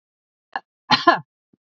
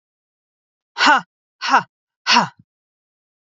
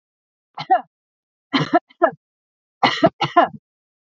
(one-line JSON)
{"cough_length": "1.7 s", "cough_amplitude": 27872, "cough_signal_mean_std_ratio": 0.26, "exhalation_length": "3.6 s", "exhalation_amplitude": 28337, "exhalation_signal_mean_std_ratio": 0.31, "three_cough_length": "4.0 s", "three_cough_amplitude": 32767, "three_cough_signal_mean_std_ratio": 0.34, "survey_phase": "beta (2021-08-13 to 2022-03-07)", "age": "18-44", "gender": "Female", "wearing_mask": "No", "symptom_none": true, "smoker_status": "Never smoked", "respiratory_condition_asthma": false, "respiratory_condition_other": false, "recruitment_source": "REACT", "submission_delay": "1 day", "covid_test_result": "Negative", "covid_test_method": "RT-qPCR", "influenza_a_test_result": "Negative", "influenza_b_test_result": "Negative"}